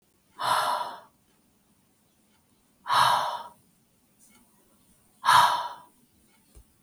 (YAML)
exhalation_length: 6.8 s
exhalation_amplitude: 14998
exhalation_signal_mean_std_ratio: 0.36
survey_phase: beta (2021-08-13 to 2022-03-07)
age: 45-64
gender: Female
wearing_mask: 'No'
symptom_cough_any: true
symptom_sore_throat: true
symptom_onset: 7 days
smoker_status: Never smoked
respiratory_condition_asthma: false
respiratory_condition_other: false
recruitment_source: Test and Trace
submission_delay: 1 day
covid_test_result: Positive
covid_test_method: RT-qPCR
covid_ct_value: 29.1
covid_ct_gene: ORF1ab gene